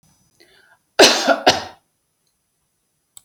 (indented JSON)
{
  "cough_length": "3.2 s",
  "cough_amplitude": 32768,
  "cough_signal_mean_std_ratio": 0.29,
  "survey_phase": "beta (2021-08-13 to 2022-03-07)",
  "age": "65+",
  "gender": "Female",
  "wearing_mask": "No",
  "symptom_none": true,
  "smoker_status": "Never smoked",
  "respiratory_condition_asthma": false,
  "respiratory_condition_other": false,
  "recruitment_source": "REACT",
  "submission_delay": "2 days",
  "covid_test_result": "Negative",
  "covid_test_method": "RT-qPCR",
  "influenza_a_test_result": "Negative",
  "influenza_b_test_result": "Negative"
}